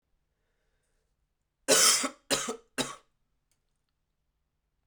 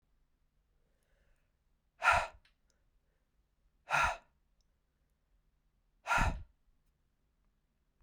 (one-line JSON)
{"cough_length": "4.9 s", "cough_amplitude": 12520, "cough_signal_mean_std_ratio": 0.28, "exhalation_length": "8.0 s", "exhalation_amplitude": 5821, "exhalation_signal_mean_std_ratio": 0.25, "survey_phase": "beta (2021-08-13 to 2022-03-07)", "age": "18-44", "gender": "Male", "wearing_mask": "No", "symptom_cough_any": true, "symptom_runny_or_blocked_nose": true, "symptom_fever_high_temperature": true, "symptom_onset": "3 days", "smoker_status": "Never smoked", "respiratory_condition_asthma": false, "respiratory_condition_other": false, "recruitment_source": "Test and Trace", "submission_delay": "1 day", "covid_test_result": "Positive", "covid_test_method": "RT-qPCR"}